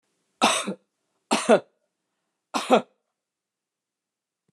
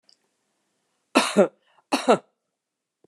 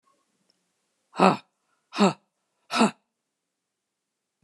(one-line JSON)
{"three_cough_length": "4.5 s", "three_cough_amplitude": 23523, "three_cough_signal_mean_std_ratio": 0.28, "cough_length": "3.1 s", "cough_amplitude": 27619, "cough_signal_mean_std_ratio": 0.27, "exhalation_length": "4.4 s", "exhalation_amplitude": 25397, "exhalation_signal_mean_std_ratio": 0.25, "survey_phase": "beta (2021-08-13 to 2022-03-07)", "age": "65+", "gender": "Female", "wearing_mask": "No", "symptom_none": true, "smoker_status": "Never smoked", "respiratory_condition_asthma": false, "respiratory_condition_other": false, "recruitment_source": "REACT", "submission_delay": "1 day", "covid_test_result": "Negative", "covid_test_method": "RT-qPCR"}